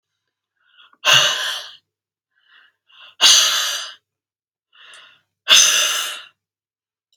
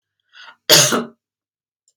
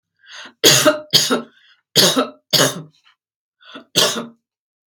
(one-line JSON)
{"exhalation_length": "7.2 s", "exhalation_amplitude": 32768, "exhalation_signal_mean_std_ratio": 0.38, "cough_length": "2.0 s", "cough_amplitude": 32768, "cough_signal_mean_std_ratio": 0.32, "three_cough_length": "4.9 s", "three_cough_amplitude": 32768, "three_cough_signal_mean_std_ratio": 0.43, "survey_phase": "beta (2021-08-13 to 2022-03-07)", "age": "18-44", "gender": "Female", "wearing_mask": "No", "symptom_none": true, "smoker_status": "Never smoked", "respiratory_condition_asthma": false, "respiratory_condition_other": false, "recruitment_source": "REACT", "submission_delay": "1 day", "covid_test_result": "Negative", "covid_test_method": "RT-qPCR", "influenza_a_test_result": "Negative", "influenza_b_test_result": "Negative"}